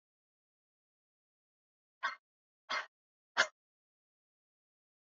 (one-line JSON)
{"exhalation_length": "5.0 s", "exhalation_amplitude": 6106, "exhalation_signal_mean_std_ratio": 0.17, "survey_phase": "beta (2021-08-13 to 2022-03-07)", "age": "18-44", "gender": "Female", "wearing_mask": "No", "symptom_none": true, "symptom_onset": "3 days", "smoker_status": "Never smoked", "respiratory_condition_asthma": false, "respiratory_condition_other": false, "recruitment_source": "REACT", "submission_delay": "1 day", "covid_test_result": "Negative", "covid_test_method": "RT-qPCR", "influenza_a_test_result": "Unknown/Void", "influenza_b_test_result": "Unknown/Void"}